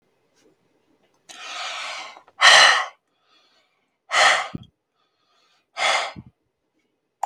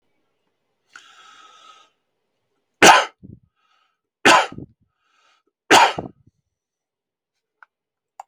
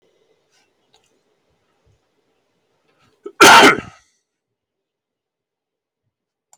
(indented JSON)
{
  "exhalation_length": "7.3 s",
  "exhalation_amplitude": 32766,
  "exhalation_signal_mean_std_ratio": 0.32,
  "three_cough_length": "8.3 s",
  "three_cough_amplitude": 32766,
  "three_cough_signal_mean_std_ratio": 0.23,
  "cough_length": "6.6 s",
  "cough_amplitude": 32768,
  "cough_signal_mean_std_ratio": 0.21,
  "survey_phase": "beta (2021-08-13 to 2022-03-07)",
  "age": "45-64",
  "gender": "Male",
  "wearing_mask": "No",
  "symptom_runny_or_blocked_nose": true,
  "smoker_status": "Never smoked",
  "respiratory_condition_asthma": false,
  "respiratory_condition_other": false,
  "recruitment_source": "REACT",
  "submission_delay": "2 days",
  "covid_test_result": "Negative",
  "covid_test_method": "RT-qPCR",
  "influenza_a_test_result": "Negative",
  "influenza_b_test_result": "Negative"
}